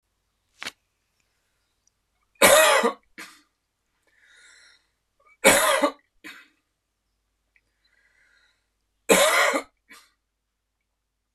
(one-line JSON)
{"three_cough_length": "11.3 s", "three_cough_amplitude": 25981, "three_cough_signal_mean_std_ratio": 0.29, "survey_phase": "beta (2021-08-13 to 2022-03-07)", "age": "45-64", "gender": "Male", "wearing_mask": "No", "symptom_runny_or_blocked_nose": true, "symptom_headache": true, "smoker_status": "Never smoked", "respiratory_condition_asthma": true, "respiratory_condition_other": false, "recruitment_source": "Test and Trace", "submission_delay": "1 day", "covid_test_result": "Positive", "covid_test_method": "LFT"}